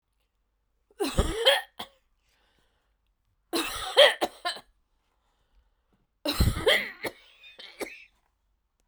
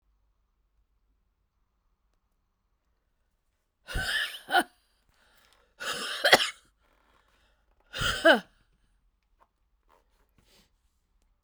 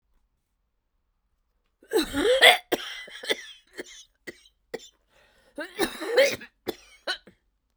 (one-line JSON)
{"three_cough_length": "8.9 s", "three_cough_amplitude": 20742, "three_cough_signal_mean_std_ratio": 0.33, "exhalation_length": "11.4 s", "exhalation_amplitude": 28480, "exhalation_signal_mean_std_ratio": 0.24, "cough_length": "7.8 s", "cough_amplitude": 30934, "cough_signal_mean_std_ratio": 0.32, "survey_phase": "beta (2021-08-13 to 2022-03-07)", "age": "45-64", "gender": "Female", "wearing_mask": "No", "symptom_cough_any": true, "symptom_shortness_of_breath": true, "symptom_diarrhoea": true, "symptom_fatigue": true, "symptom_headache": true, "symptom_other": true, "smoker_status": "Ex-smoker", "respiratory_condition_asthma": true, "respiratory_condition_other": false, "recruitment_source": "Test and Trace", "submission_delay": "2 days", "covid_test_result": "Positive", "covid_test_method": "RT-qPCR", "covid_ct_value": 38.1, "covid_ct_gene": "ORF1ab gene"}